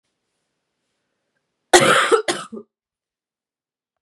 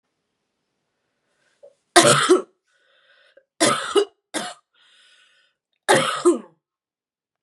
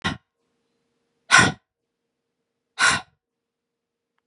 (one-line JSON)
{"cough_length": "4.0 s", "cough_amplitude": 32768, "cough_signal_mean_std_ratio": 0.28, "three_cough_length": "7.4 s", "three_cough_amplitude": 32767, "three_cough_signal_mean_std_ratio": 0.32, "exhalation_length": "4.3 s", "exhalation_amplitude": 31112, "exhalation_signal_mean_std_ratio": 0.25, "survey_phase": "beta (2021-08-13 to 2022-03-07)", "age": "18-44", "gender": "Female", "wearing_mask": "No", "symptom_cough_any": true, "symptom_runny_or_blocked_nose": true, "symptom_shortness_of_breath": true, "symptom_sore_throat": true, "symptom_fatigue": true, "symptom_onset": "3 days", "smoker_status": "Never smoked", "respiratory_condition_asthma": false, "respiratory_condition_other": false, "recruitment_source": "Test and Trace", "submission_delay": "2 days", "covid_test_result": "Positive", "covid_test_method": "RT-qPCR", "covid_ct_value": 22.3, "covid_ct_gene": "ORF1ab gene", "covid_ct_mean": 22.6, "covid_viral_load": "38000 copies/ml", "covid_viral_load_category": "Low viral load (10K-1M copies/ml)"}